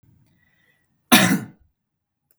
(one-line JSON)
{"cough_length": "2.4 s", "cough_amplitude": 32768, "cough_signal_mean_std_ratio": 0.27, "survey_phase": "beta (2021-08-13 to 2022-03-07)", "age": "18-44", "gender": "Male", "wearing_mask": "No", "symptom_none": true, "smoker_status": "Never smoked", "respiratory_condition_asthma": false, "respiratory_condition_other": false, "recruitment_source": "REACT", "submission_delay": "0 days", "covid_test_result": "Negative", "covid_test_method": "RT-qPCR", "influenza_a_test_result": "Negative", "influenza_b_test_result": "Negative"}